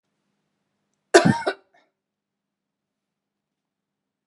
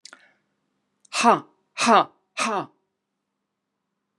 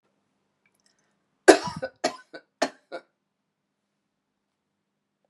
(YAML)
cough_length: 4.3 s
cough_amplitude: 32767
cough_signal_mean_std_ratio: 0.18
exhalation_length: 4.2 s
exhalation_amplitude: 25301
exhalation_signal_mean_std_ratio: 0.3
three_cough_length: 5.3 s
three_cough_amplitude: 32767
three_cough_signal_mean_std_ratio: 0.15
survey_phase: beta (2021-08-13 to 2022-03-07)
age: 45-64
gender: Female
wearing_mask: 'No'
symptom_none: true
smoker_status: Never smoked
respiratory_condition_asthma: false
respiratory_condition_other: false
recruitment_source: REACT
submission_delay: 1 day
covid_test_result: Negative
covid_test_method: RT-qPCR
influenza_a_test_result: Negative
influenza_b_test_result: Negative